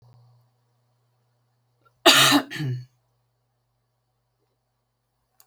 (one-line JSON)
{"cough_length": "5.5 s", "cough_amplitude": 32767, "cough_signal_mean_std_ratio": 0.24, "survey_phase": "beta (2021-08-13 to 2022-03-07)", "age": "65+", "gender": "Female", "wearing_mask": "No", "symptom_none": true, "smoker_status": "Ex-smoker", "respiratory_condition_asthma": false, "respiratory_condition_other": false, "recruitment_source": "REACT", "submission_delay": "1 day", "covid_test_result": "Negative", "covid_test_method": "RT-qPCR"}